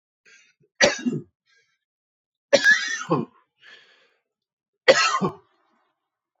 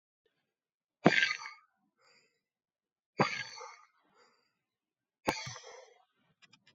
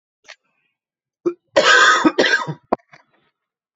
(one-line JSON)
{"three_cough_length": "6.4 s", "three_cough_amplitude": 28590, "three_cough_signal_mean_std_ratio": 0.33, "exhalation_length": "6.7 s", "exhalation_amplitude": 20279, "exhalation_signal_mean_std_ratio": 0.23, "cough_length": "3.8 s", "cough_amplitude": 28007, "cough_signal_mean_std_ratio": 0.4, "survey_phase": "alpha (2021-03-01 to 2021-08-12)", "age": "18-44", "gender": "Male", "wearing_mask": "No", "symptom_cough_any": true, "symptom_fatigue": true, "symptom_fever_high_temperature": true, "symptom_headache": true, "smoker_status": "Current smoker (1 to 10 cigarettes per day)", "respiratory_condition_asthma": false, "respiratory_condition_other": false, "recruitment_source": "Test and Trace", "submission_delay": "3 days", "covid_test_result": "Positive", "covid_test_method": "RT-qPCR"}